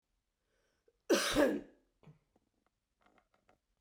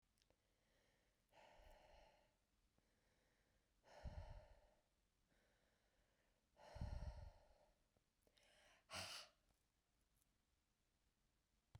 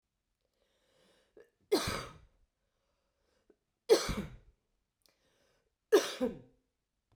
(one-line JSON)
{"cough_length": "3.8 s", "cough_amplitude": 4142, "cough_signal_mean_std_ratio": 0.29, "exhalation_length": "11.8 s", "exhalation_amplitude": 424, "exhalation_signal_mean_std_ratio": 0.37, "three_cough_length": "7.2 s", "three_cough_amplitude": 7925, "three_cough_signal_mean_std_ratio": 0.25, "survey_phase": "beta (2021-08-13 to 2022-03-07)", "age": "45-64", "gender": "Female", "wearing_mask": "No", "symptom_cough_any": true, "symptom_sore_throat": true, "symptom_fatigue": true, "symptom_headache": true, "symptom_onset": "3 days", "smoker_status": "Never smoked", "respiratory_condition_asthma": false, "respiratory_condition_other": false, "recruitment_source": "Test and Trace", "submission_delay": "1 day", "covid_test_result": "Positive", "covid_test_method": "RT-qPCR"}